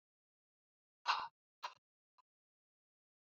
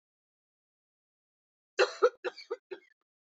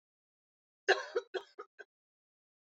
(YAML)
exhalation_length: 3.2 s
exhalation_amplitude: 2589
exhalation_signal_mean_std_ratio: 0.2
three_cough_length: 3.3 s
three_cough_amplitude: 7428
three_cough_signal_mean_std_ratio: 0.22
cough_length: 2.6 s
cough_amplitude: 6306
cough_signal_mean_std_ratio: 0.23
survey_phase: beta (2021-08-13 to 2022-03-07)
age: 45-64
gender: Female
wearing_mask: 'No'
symptom_none: true
smoker_status: Never smoked
respiratory_condition_asthma: true
respiratory_condition_other: false
recruitment_source: REACT
submission_delay: 2 days
covid_test_result: Negative
covid_test_method: RT-qPCR